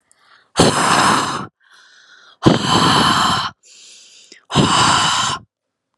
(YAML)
exhalation_length: 6.0 s
exhalation_amplitude: 32768
exhalation_signal_mean_std_ratio: 0.6
survey_phase: alpha (2021-03-01 to 2021-08-12)
age: 18-44
gender: Female
wearing_mask: 'No'
symptom_none: true
smoker_status: Never smoked
respiratory_condition_asthma: false
respiratory_condition_other: false
recruitment_source: Test and Trace
submission_delay: 0 days
covid_test_result: Negative
covid_test_method: LFT